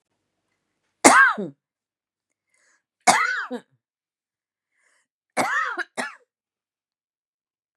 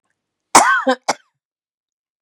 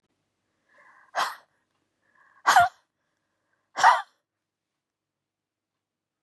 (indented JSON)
{
  "three_cough_length": "7.8 s",
  "three_cough_amplitude": 32768,
  "three_cough_signal_mean_std_ratio": 0.28,
  "cough_length": "2.2 s",
  "cough_amplitude": 32768,
  "cough_signal_mean_std_ratio": 0.32,
  "exhalation_length": "6.2 s",
  "exhalation_amplitude": 18383,
  "exhalation_signal_mean_std_ratio": 0.23,
  "survey_phase": "beta (2021-08-13 to 2022-03-07)",
  "age": "65+",
  "gender": "Female",
  "wearing_mask": "No",
  "symptom_cough_any": true,
  "symptom_shortness_of_breath": true,
  "symptom_fatigue": true,
  "symptom_onset": "12 days",
  "smoker_status": "Never smoked",
  "respiratory_condition_asthma": false,
  "respiratory_condition_other": false,
  "recruitment_source": "REACT",
  "submission_delay": "5 days",
  "covid_test_result": "Negative",
  "covid_test_method": "RT-qPCR",
  "influenza_a_test_result": "Negative",
  "influenza_b_test_result": "Negative"
}